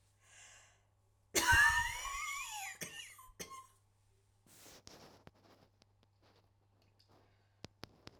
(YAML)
cough_length: 8.2 s
cough_amplitude: 4815
cough_signal_mean_std_ratio: 0.31
survey_phase: alpha (2021-03-01 to 2021-08-12)
age: 45-64
gender: Female
wearing_mask: 'No'
symptom_cough_any: true
symptom_shortness_of_breath: true
symptom_abdominal_pain: true
symptom_diarrhoea: true
symptom_fatigue: true
smoker_status: Ex-smoker
respiratory_condition_asthma: true
respiratory_condition_other: true
recruitment_source: REACT
submission_delay: 1 day
covid_test_result: Negative
covid_test_method: RT-qPCR